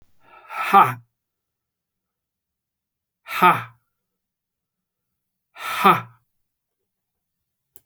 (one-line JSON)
{"exhalation_length": "7.9 s", "exhalation_amplitude": 29260, "exhalation_signal_mean_std_ratio": 0.24, "survey_phase": "beta (2021-08-13 to 2022-03-07)", "age": "65+", "gender": "Male", "wearing_mask": "No", "symptom_cough_any": true, "symptom_runny_or_blocked_nose": true, "symptom_sore_throat": true, "smoker_status": "Never smoked", "respiratory_condition_asthma": false, "respiratory_condition_other": false, "recruitment_source": "Test and Trace", "submission_delay": "1 day", "covid_test_result": "Positive", "covid_test_method": "LFT"}